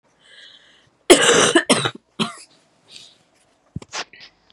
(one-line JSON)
{"cough_length": "4.5 s", "cough_amplitude": 32768, "cough_signal_mean_std_ratio": 0.33, "survey_phase": "beta (2021-08-13 to 2022-03-07)", "age": "18-44", "gender": "Female", "wearing_mask": "No", "symptom_cough_any": true, "symptom_abdominal_pain": true, "symptom_fatigue": true, "symptom_fever_high_temperature": true, "symptom_headache": true, "symptom_other": true, "smoker_status": "Never smoked", "respiratory_condition_asthma": false, "respiratory_condition_other": false, "recruitment_source": "Test and Trace", "submission_delay": "1 day", "covid_test_result": "Positive", "covid_test_method": "RT-qPCR"}